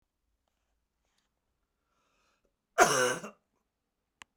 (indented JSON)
{
  "cough_length": "4.4 s",
  "cough_amplitude": 16200,
  "cough_signal_mean_std_ratio": 0.22,
  "survey_phase": "beta (2021-08-13 to 2022-03-07)",
  "age": "65+",
  "gender": "Male",
  "wearing_mask": "No",
  "symptom_cough_any": true,
  "symptom_runny_or_blocked_nose": true,
  "symptom_fatigue": true,
  "symptom_loss_of_taste": true,
  "symptom_onset": "2 days",
  "smoker_status": "Never smoked",
  "respiratory_condition_asthma": false,
  "respiratory_condition_other": false,
  "recruitment_source": "Test and Trace",
  "submission_delay": "1 day",
  "covid_test_result": "Positive",
  "covid_test_method": "RT-qPCR",
  "covid_ct_value": 17.3,
  "covid_ct_gene": "ORF1ab gene",
  "covid_ct_mean": 17.6,
  "covid_viral_load": "1700000 copies/ml",
  "covid_viral_load_category": "High viral load (>1M copies/ml)"
}